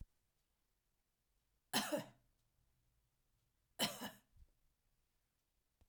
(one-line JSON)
{"cough_length": "5.9 s", "cough_amplitude": 1993, "cough_signal_mean_std_ratio": 0.25, "survey_phase": "alpha (2021-03-01 to 2021-08-12)", "age": "65+", "gender": "Female", "wearing_mask": "No", "symptom_none": true, "symptom_onset": "12 days", "smoker_status": "Ex-smoker", "respiratory_condition_asthma": false, "respiratory_condition_other": false, "recruitment_source": "REACT", "submission_delay": "1 day", "covid_test_result": "Negative", "covid_test_method": "RT-qPCR"}